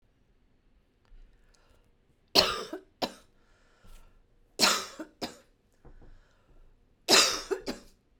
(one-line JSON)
{"three_cough_length": "8.2 s", "three_cough_amplitude": 19678, "three_cough_signal_mean_std_ratio": 0.29, "survey_phase": "beta (2021-08-13 to 2022-03-07)", "age": "45-64", "gender": "Female", "wearing_mask": "No", "symptom_none": true, "smoker_status": "Ex-smoker", "respiratory_condition_asthma": false, "respiratory_condition_other": false, "recruitment_source": "REACT", "submission_delay": "1 day", "covid_test_result": "Negative", "covid_test_method": "RT-qPCR"}